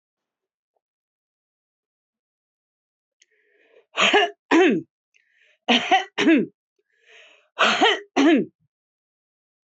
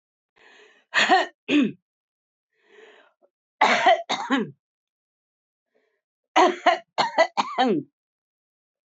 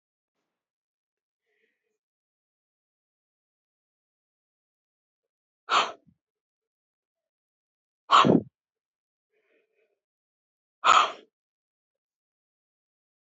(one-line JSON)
{"cough_length": "9.7 s", "cough_amplitude": 20746, "cough_signal_mean_std_ratio": 0.36, "three_cough_length": "8.9 s", "three_cough_amplitude": 19311, "three_cough_signal_mean_std_ratio": 0.39, "exhalation_length": "13.3 s", "exhalation_amplitude": 18131, "exhalation_signal_mean_std_ratio": 0.17, "survey_phase": "beta (2021-08-13 to 2022-03-07)", "age": "65+", "gender": "Female", "wearing_mask": "No", "symptom_none": true, "smoker_status": "Ex-smoker", "respiratory_condition_asthma": false, "respiratory_condition_other": false, "recruitment_source": "REACT", "submission_delay": "2 days", "covid_test_result": "Negative", "covid_test_method": "RT-qPCR"}